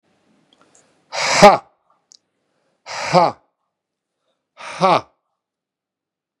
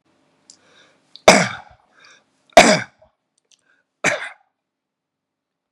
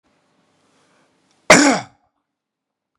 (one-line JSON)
{"exhalation_length": "6.4 s", "exhalation_amplitude": 32768, "exhalation_signal_mean_std_ratio": 0.26, "three_cough_length": "5.7 s", "three_cough_amplitude": 32768, "three_cough_signal_mean_std_ratio": 0.23, "cough_length": "3.0 s", "cough_amplitude": 32768, "cough_signal_mean_std_ratio": 0.24, "survey_phase": "beta (2021-08-13 to 2022-03-07)", "age": "45-64", "gender": "Male", "wearing_mask": "No", "symptom_none": true, "smoker_status": "Never smoked", "respiratory_condition_asthma": false, "respiratory_condition_other": false, "recruitment_source": "REACT", "submission_delay": "1 day", "covid_test_result": "Negative", "covid_test_method": "RT-qPCR", "influenza_a_test_result": "Negative", "influenza_b_test_result": "Negative"}